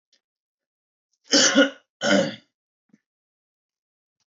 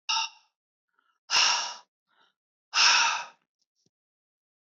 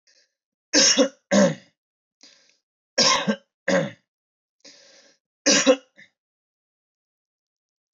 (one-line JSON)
{"cough_length": "4.3 s", "cough_amplitude": 19155, "cough_signal_mean_std_ratio": 0.3, "exhalation_length": "4.6 s", "exhalation_amplitude": 13708, "exhalation_signal_mean_std_ratio": 0.38, "three_cough_length": "7.9 s", "three_cough_amplitude": 18840, "three_cough_signal_mean_std_ratio": 0.33, "survey_phase": "beta (2021-08-13 to 2022-03-07)", "age": "18-44", "gender": "Male", "wearing_mask": "No", "symptom_runny_or_blocked_nose": true, "symptom_diarrhoea": true, "symptom_headache": true, "symptom_onset": "9 days", "smoker_status": "Never smoked", "respiratory_condition_asthma": false, "respiratory_condition_other": false, "recruitment_source": "REACT", "submission_delay": "1 day", "covid_test_result": "Negative", "covid_test_method": "RT-qPCR"}